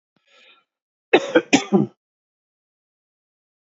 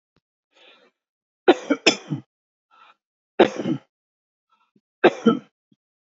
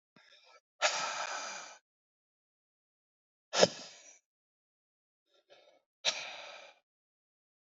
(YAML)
cough_length: 3.7 s
cough_amplitude: 27109
cough_signal_mean_std_ratio: 0.25
three_cough_length: 6.1 s
three_cough_amplitude: 29227
three_cough_signal_mean_std_ratio: 0.24
exhalation_length: 7.7 s
exhalation_amplitude: 15542
exhalation_signal_mean_std_ratio: 0.26
survey_phase: beta (2021-08-13 to 2022-03-07)
age: 45-64
gender: Male
wearing_mask: 'No'
symptom_cough_any: true
symptom_sore_throat: true
symptom_headache: true
symptom_onset: 4 days
smoker_status: Never smoked
respiratory_condition_asthma: false
respiratory_condition_other: false
recruitment_source: REACT
submission_delay: 2 days
covid_test_result: Positive
covid_test_method: RT-qPCR
covid_ct_value: 20.8
covid_ct_gene: E gene
influenza_a_test_result: Negative
influenza_b_test_result: Negative